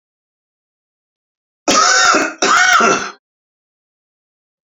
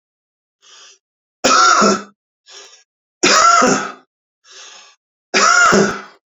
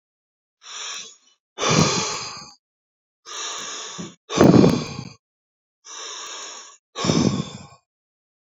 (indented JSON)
{
  "cough_length": "4.8 s",
  "cough_amplitude": 32684,
  "cough_signal_mean_std_ratio": 0.44,
  "three_cough_length": "6.3 s",
  "three_cough_amplitude": 32746,
  "three_cough_signal_mean_std_ratio": 0.48,
  "exhalation_length": "8.5 s",
  "exhalation_amplitude": 32189,
  "exhalation_signal_mean_std_ratio": 0.39,
  "survey_phase": "beta (2021-08-13 to 2022-03-07)",
  "age": "45-64",
  "gender": "Male",
  "wearing_mask": "No",
  "symptom_none": true,
  "smoker_status": "Ex-smoker",
  "respiratory_condition_asthma": false,
  "respiratory_condition_other": false,
  "recruitment_source": "REACT",
  "submission_delay": "5 days",
  "covid_test_result": "Negative",
  "covid_test_method": "RT-qPCR"
}